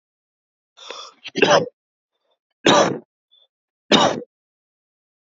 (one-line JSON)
{"three_cough_length": "5.2 s", "three_cough_amplitude": 30154, "three_cough_signal_mean_std_ratio": 0.32, "survey_phase": "alpha (2021-03-01 to 2021-08-12)", "age": "18-44", "gender": "Male", "wearing_mask": "No", "symptom_cough_any": true, "symptom_change_to_sense_of_smell_or_taste": true, "smoker_status": "Prefer not to say", "respiratory_condition_asthma": false, "respiratory_condition_other": false, "recruitment_source": "Test and Trace", "submission_delay": "2 days", "covid_test_result": "Positive", "covid_test_method": "LFT"}